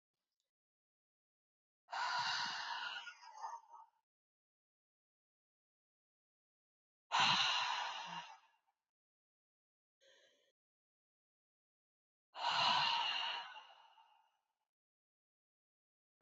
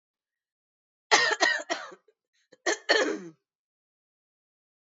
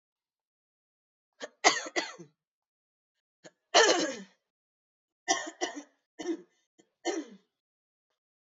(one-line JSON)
{"exhalation_length": "16.2 s", "exhalation_amplitude": 2883, "exhalation_signal_mean_std_ratio": 0.36, "cough_length": "4.9 s", "cough_amplitude": 21245, "cough_signal_mean_std_ratio": 0.34, "three_cough_length": "8.5 s", "three_cough_amplitude": 16188, "three_cough_signal_mean_std_ratio": 0.27, "survey_phase": "beta (2021-08-13 to 2022-03-07)", "age": "45-64", "gender": "Female", "wearing_mask": "No", "symptom_cough_any": true, "symptom_runny_or_blocked_nose": true, "symptom_abdominal_pain": true, "symptom_change_to_sense_of_smell_or_taste": true, "symptom_other": true, "symptom_onset": "6 days", "smoker_status": "Never smoked", "respiratory_condition_asthma": false, "respiratory_condition_other": false, "recruitment_source": "Test and Trace", "submission_delay": "2 days", "covid_test_result": "Positive", "covid_test_method": "ePCR"}